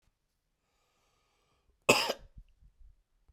cough_length: 3.3 s
cough_amplitude: 15775
cough_signal_mean_std_ratio: 0.2
survey_phase: beta (2021-08-13 to 2022-03-07)
age: 18-44
gender: Male
wearing_mask: 'No'
symptom_cough_any: true
symptom_runny_or_blocked_nose: true
symptom_shortness_of_breath: true
symptom_onset: 4 days
smoker_status: Never smoked
respiratory_condition_asthma: false
respiratory_condition_other: false
recruitment_source: Test and Trace
submission_delay: 2 days
covid_test_result: Positive
covid_test_method: RT-qPCR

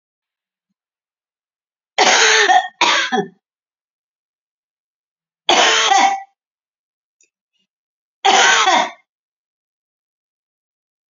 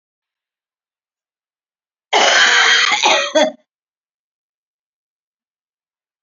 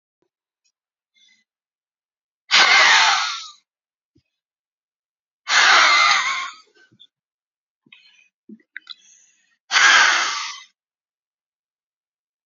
three_cough_length: 11.1 s
three_cough_amplitude: 31228
three_cough_signal_mean_std_ratio: 0.38
cough_length: 6.2 s
cough_amplitude: 32767
cough_signal_mean_std_ratio: 0.38
exhalation_length: 12.5 s
exhalation_amplitude: 29263
exhalation_signal_mean_std_ratio: 0.36
survey_phase: beta (2021-08-13 to 2022-03-07)
age: 45-64
gender: Female
wearing_mask: 'No'
symptom_none: true
smoker_status: Current smoker (1 to 10 cigarettes per day)
respiratory_condition_asthma: false
respiratory_condition_other: false
recruitment_source: REACT
submission_delay: 3 days
covid_test_result: Negative
covid_test_method: RT-qPCR
influenza_a_test_result: Negative
influenza_b_test_result: Negative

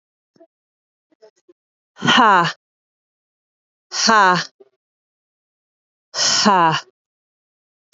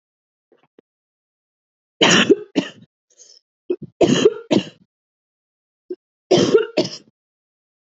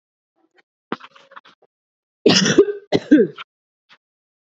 exhalation_length: 7.9 s
exhalation_amplitude: 28963
exhalation_signal_mean_std_ratio: 0.35
three_cough_length: 7.9 s
three_cough_amplitude: 28242
three_cough_signal_mean_std_ratio: 0.32
cough_length: 4.5 s
cough_amplitude: 31817
cough_signal_mean_std_ratio: 0.31
survey_phase: beta (2021-08-13 to 2022-03-07)
age: 18-44
gender: Female
wearing_mask: 'No'
symptom_runny_or_blocked_nose: true
symptom_shortness_of_breath: true
symptom_fatigue: true
smoker_status: Ex-smoker
respiratory_condition_asthma: false
respiratory_condition_other: false
recruitment_source: Test and Trace
submission_delay: 2 days
covid_test_result: Positive
covid_test_method: RT-qPCR
covid_ct_value: 13.8
covid_ct_gene: ORF1ab gene
covid_ct_mean: 14.2
covid_viral_load: 22000000 copies/ml
covid_viral_load_category: High viral load (>1M copies/ml)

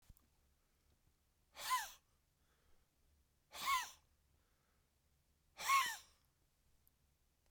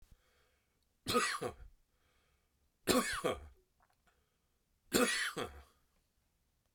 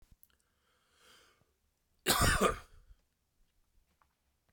exhalation_length: 7.5 s
exhalation_amplitude: 2457
exhalation_signal_mean_std_ratio: 0.28
three_cough_length: 6.7 s
three_cough_amplitude: 5593
three_cough_signal_mean_std_ratio: 0.36
cough_length: 4.5 s
cough_amplitude: 6509
cough_signal_mean_std_ratio: 0.27
survey_phase: beta (2021-08-13 to 2022-03-07)
age: 65+
gender: Male
wearing_mask: 'No'
symptom_none: true
smoker_status: Never smoked
respiratory_condition_asthma: true
respiratory_condition_other: false
recruitment_source: REACT
submission_delay: 3 days
covid_test_result: Negative
covid_test_method: RT-qPCR
influenza_a_test_result: Unknown/Void
influenza_b_test_result: Unknown/Void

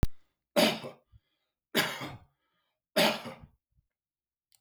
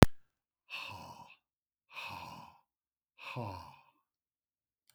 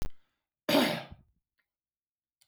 three_cough_length: 4.6 s
three_cough_amplitude: 8982
three_cough_signal_mean_std_ratio: 0.34
exhalation_length: 4.9 s
exhalation_amplitude: 32768
exhalation_signal_mean_std_ratio: 0.17
cough_length: 2.5 s
cough_amplitude: 8844
cough_signal_mean_std_ratio: 0.34
survey_phase: beta (2021-08-13 to 2022-03-07)
age: 65+
gender: Male
wearing_mask: 'No'
symptom_none: true
smoker_status: Ex-smoker
respiratory_condition_asthma: false
respiratory_condition_other: false
recruitment_source: Test and Trace
submission_delay: 0 days
covid_test_result: Negative
covid_test_method: LFT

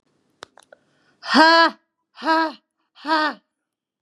exhalation_length: 4.0 s
exhalation_amplitude: 31546
exhalation_signal_mean_std_ratio: 0.36
survey_phase: beta (2021-08-13 to 2022-03-07)
age: 45-64
gender: Female
wearing_mask: 'No'
symptom_cough_any: true
symptom_fatigue: true
smoker_status: Never smoked
respiratory_condition_asthma: false
respiratory_condition_other: false
recruitment_source: Test and Trace
submission_delay: 2 days
covid_test_result: Positive
covid_test_method: RT-qPCR
covid_ct_value: 16.2
covid_ct_gene: ORF1ab gene
covid_ct_mean: 16.6
covid_viral_load: 3500000 copies/ml
covid_viral_load_category: High viral load (>1M copies/ml)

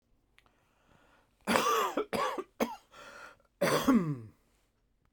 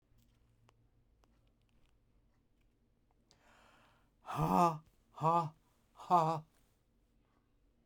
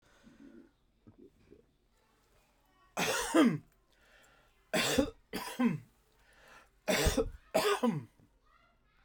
cough_length: 5.1 s
cough_amplitude: 13654
cough_signal_mean_std_ratio: 0.45
exhalation_length: 7.9 s
exhalation_amplitude: 4581
exhalation_signal_mean_std_ratio: 0.29
three_cough_length: 9.0 s
three_cough_amplitude: 7177
three_cough_signal_mean_std_ratio: 0.4
survey_phase: beta (2021-08-13 to 2022-03-07)
age: 45-64
gender: Male
wearing_mask: 'No'
symptom_none: true
smoker_status: Never smoked
respiratory_condition_asthma: false
respiratory_condition_other: false
recruitment_source: REACT
submission_delay: 3 days
covid_test_result: Negative
covid_test_method: RT-qPCR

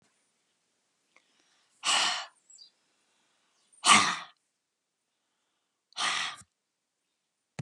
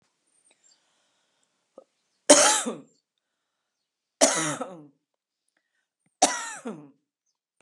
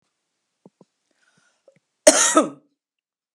exhalation_length: 7.6 s
exhalation_amplitude: 16372
exhalation_signal_mean_std_ratio: 0.27
three_cough_length: 7.6 s
three_cough_amplitude: 30924
three_cough_signal_mean_std_ratio: 0.25
cough_length: 3.3 s
cough_amplitude: 32767
cough_signal_mean_std_ratio: 0.24
survey_phase: beta (2021-08-13 to 2022-03-07)
age: 65+
gender: Female
wearing_mask: 'No'
symptom_none: true
smoker_status: Ex-smoker
respiratory_condition_asthma: false
respiratory_condition_other: false
recruitment_source: REACT
submission_delay: 2 days
covid_test_result: Negative
covid_test_method: RT-qPCR
influenza_a_test_result: Negative
influenza_b_test_result: Negative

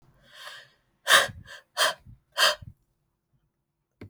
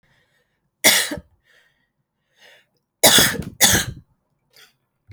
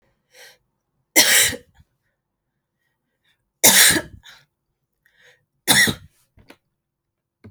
exhalation_length: 4.1 s
exhalation_amplitude: 18867
exhalation_signal_mean_std_ratio: 0.3
cough_length: 5.1 s
cough_amplitude: 32768
cough_signal_mean_std_ratio: 0.32
three_cough_length: 7.5 s
three_cough_amplitude: 32768
three_cough_signal_mean_std_ratio: 0.29
survey_phase: alpha (2021-03-01 to 2021-08-12)
age: 18-44
gender: Female
wearing_mask: 'No'
symptom_cough_any: true
symptom_shortness_of_breath: true
symptom_fatigue: true
symptom_onset: 13 days
smoker_status: Ex-smoker
respiratory_condition_asthma: true
respiratory_condition_other: false
recruitment_source: REACT
submission_delay: 2 days
covid_test_result: Negative
covid_test_method: RT-qPCR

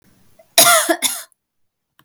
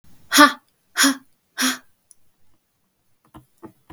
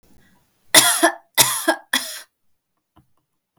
cough_length: 2.0 s
cough_amplitude: 32768
cough_signal_mean_std_ratio: 0.39
exhalation_length: 3.9 s
exhalation_amplitude: 32768
exhalation_signal_mean_std_ratio: 0.28
three_cough_length: 3.6 s
three_cough_amplitude: 32768
three_cough_signal_mean_std_ratio: 0.35
survey_phase: beta (2021-08-13 to 2022-03-07)
age: 18-44
gender: Female
wearing_mask: 'No'
symptom_none: true
smoker_status: Never smoked
respiratory_condition_asthma: false
respiratory_condition_other: false
recruitment_source: REACT
submission_delay: 4 days
covid_test_result: Negative
covid_test_method: RT-qPCR
influenza_a_test_result: Negative
influenza_b_test_result: Negative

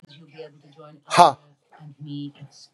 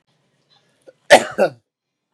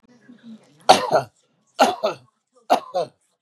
exhalation_length: 2.7 s
exhalation_amplitude: 32767
exhalation_signal_mean_std_ratio: 0.25
cough_length: 2.1 s
cough_amplitude: 32768
cough_signal_mean_std_ratio: 0.24
three_cough_length: 3.4 s
three_cough_amplitude: 32768
three_cough_signal_mean_std_ratio: 0.34
survey_phase: beta (2021-08-13 to 2022-03-07)
age: 45-64
gender: Male
wearing_mask: 'No'
symptom_runny_or_blocked_nose: true
symptom_onset: 12 days
smoker_status: Current smoker (e-cigarettes or vapes only)
respiratory_condition_asthma: false
respiratory_condition_other: false
recruitment_source: REACT
submission_delay: 3 days
covid_test_result: Negative
covid_test_method: RT-qPCR
influenza_a_test_result: Negative
influenza_b_test_result: Negative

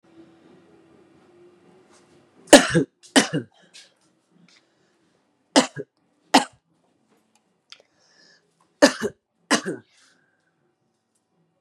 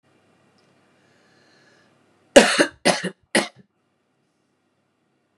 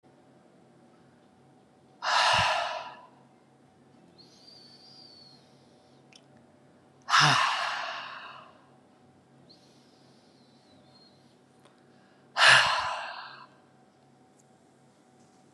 three_cough_length: 11.6 s
three_cough_amplitude: 32768
three_cough_signal_mean_std_ratio: 0.2
cough_length: 5.4 s
cough_amplitude: 32768
cough_signal_mean_std_ratio: 0.22
exhalation_length: 15.5 s
exhalation_amplitude: 16991
exhalation_signal_mean_std_ratio: 0.32
survey_phase: beta (2021-08-13 to 2022-03-07)
age: 45-64
gender: Female
wearing_mask: 'No'
symptom_cough_any: true
symptom_runny_or_blocked_nose: true
symptom_diarrhoea: true
symptom_fatigue: true
symptom_onset: 6 days
smoker_status: Ex-smoker
respiratory_condition_asthma: false
respiratory_condition_other: false
recruitment_source: Test and Trace
submission_delay: 1 day
covid_test_result: Positive
covid_test_method: RT-qPCR
covid_ct_value: 27.1
covid_ct_gene: ORF1ab gene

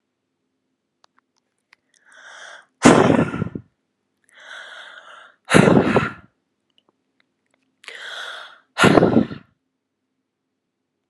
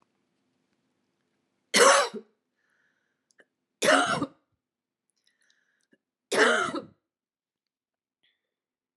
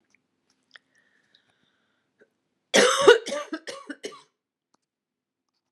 exhalation_length: 11.1 s
exhalation_amplitude: 32768
exhalation_signal_mean_std_ratio: 0.3
three_cough_length: 9.0 s
three_cough_amplitude: 16522
three_cough_signal_mean_std_ratio: 0.28
cough_length: 5.7 s
cough_amplitude: 31423
cough_signal_mean_std_ratio: 0.24
survey_phase: beta (2021-08-13 to 2022-03-07)
age: 18-44
gender: Female
wearing_mask: 'No'
symptom_cough_any: true
symptom_runny_or_blocked_nose: true
symptom_onset: 6 days
smoker_status: Never smoked
respiratory_condition_asthma: false
respiratory_condition_other: false
recruitment_source: Test and Trace
submission_delay: 2 days
covid_test_result: Positive
covid_test_method: ePCR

